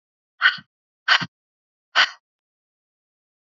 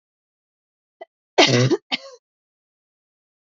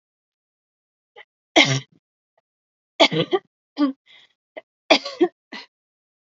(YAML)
exhalation_length: 3.5 s
exhalation_amplitude: 26417
exhalation_signal_mean_std_ratio: 0.25
cough_length: 3.5 s
cough_amplitude: 29742
cough_signal_mean_std_ratio: 0.28
three_cough_length: 6.4 s
three_cough_amplitude: 32767
three_cough_signal_mean_std_ratio: 0.27
survey_phase: beta (2021-08-13 to 2022-03-07)
age: 18-44
gender: Female
wearing_mask: 'No'
symptom_cough_any: true
symptom_runny_or_blocked_nose: true
symptom_sore_throat: true
symptom_headache: true
symptom_onset: 3 days
smoker_status: Never smoked
respiratory_condition_asthma: false
respiratory_condition_other: false
recruitment_source: Test and Trace
submission_delay: 2 days
covid_test_result: Positive
covid_test_method: RT-qPCR
covid_ct_value: 17.8
covid_ct_gene: ORF1ab gene
covid_ct_mean: 18.0
covid_viral_load: 1200000 copies/ml
covid_viral_load_category: High viral load (>1M copies/ml)